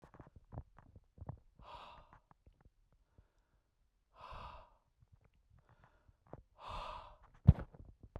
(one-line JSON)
{"exhalation_length": "8.2 s", "exhalation_amplitude": 10852, "exhalation_signal_mean_std_ratio": 0.16, "survey_phase": "beta (2021-08-13 to 2022-03-07)", "age": "45-64", "gender": "Male", "wearing_mask": "No", "symptom_cough_any": true, "symptom_sore_throat": true, "symptom_onset": "2 days", "smoker_status": "Never smoked", "respiratory_condition_asthma": false, "respiratory_condition_other": false, "recruitment_source": "REACT", "submission_delay": "3 days", "covid_test_result": "Negative", "covid_test_method": "RT-qPCR", "influenza_a_test_result": "Negative", "influenza_b_test_result": "Negative"}